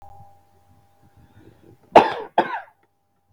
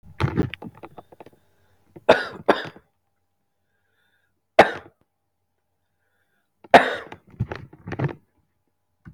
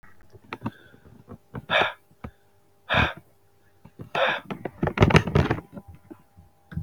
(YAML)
cough_length: 3.3 s
cough_amplitude: 32768
cough_signal_mean_std_ratio: 0.22
three_cough_length: 9.1 s
three_cough_amplitude: 32768
three_cough_signal_mean_std_ratio: 0.22
exhalation_length: 6.8 s
exhalation_amplitude: 31290
exhalation_signal_mean_std_ratio: 0.37
survey_phase: beta (2021-08-13 to 2022-03-07)
age: 45-64
gender: Male
wearing_mask: 'No'
symptom_runny_or_blocked_nose: true
symptom_sore_throat: true
symptom_fever_high_temperature: true
symptom_headache: true
symptom_change_to_sense_of_smell_or_taste: true
symptom_onset: 2 days
smoker_status: Ex-smoker
respiratory_condition_asthma: true
respiratory_condition_other: false
recruitment_source: Test and Trace
submission_delay: 1 day
covid_test_result: Positive
covid_test_method: RT-qPCR
covid_ct_value: 17.5
covid_ct_gene: ORF1ab gene
covid_ct_mean: 17.7
covid_viral_load: 1600000 copies/ml
covid_viral_load_category: High viral load (>1M copies/ml)